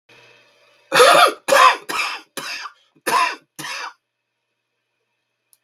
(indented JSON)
{
  "cough_length": "5.6 s",
  "cough_amplitude": 32768,
  "cough_signal_mean_std_ratio": 0.38,
  "survey_phase": "beta (2021-08-13 to 2022-03-07)",
  "age": "65+",
  "gender": "Male",
  "wearing_mask": "No",
  "symptom_cough_any": true,
  "symptom_new_continuous_cough": true,
  "symptom_runny_or_blocked_nose": true,
  "symptom_sore_throat": true,
  "symptom_headache": true,
  "symptom_onset": "11 days",
  "smoker_status": "Never smoked",
  "respiratory_condition_asthma": false,
  "respiratory_condition_other": false,
  "recruitment_source": "REACT",
  "submission_delay": "1 day",
  "covid_test_result": "Negative",
  "covid_test_method": "RT-qPCR",
  "influenza_a_test_result": "Unknown/Void",
  "influenza_b_test_result": "Unknown/Void"
}